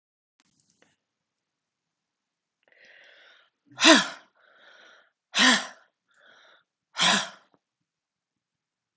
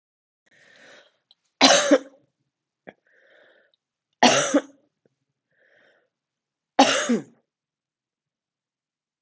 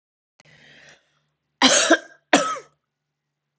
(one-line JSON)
{"exhalation_length": "9.0 s", "exhalation_amplitude": 23628, "exhalation_signal_mean_std_ratio": 0.23, "three_cough_length": "9.2 s", "three_cough_amplitude": 31963, "three_cough_signal_mean_std_ratio": 0.26, "cough_length": "3.6 s", "cough_amplitude": 31744, "cough_signal_mean_std_ratio": 0.31, "survey_phase": "beta (2021-08-13 to 2022-03-07)", "age": "45-64", "gender": "Female", "wearing_mask": "No", "symptom_cough_any": true, "symptom_runny_or_blocked_nose": true, "symptom_sore_throat": true, "symptom_fatigue": true, "symptom_headache": true, "symptom_onset": "5 days", "smoker_status": "Never smoked", "respiratory_condition_asthma": false, "respiratory_condition_other": false, "recruitment_source": "Test and Trace", "submission_delay": "2 days", "covid_test_result": "Positive", "covid_test_method": "RT-qPCR"}